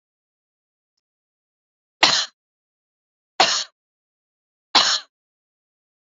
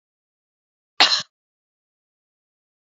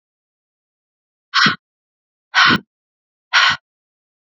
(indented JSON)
{
  "three_cough_length": "6.1 s",
  "three_cough_amplitude": 30842,
  "three_cough_signal_mean_std_ratio": 0.24,
  "cough_length": "3.0 s",
  "cough_amplitude": 32768,
  "cough_signal_mean_std_ratio": 0.18,
  "exhalation_length": "4.3 s",
  "exhalation_amplitude": 32768,
  "exhalation_signal_mean_std_ratio": 0.31,
  "survey_phase": "beta (2021-08-13 to 2022-03-07)",
  "age": "45-64",
  "gender": "Female",
  "wearing_mask": "No",
  "symptom_sore_throat": true,
  "smoker_status": "Never smoked",
  "respiratory_condition_asthma": false,
  "respiratory_condition_other": false,
  "recruitment_source": "Test and Trace",
  "submission_delay": "2 days",
  "covid_test_result": "Negative",
  "covid_test_method": "RT-qPCR"
}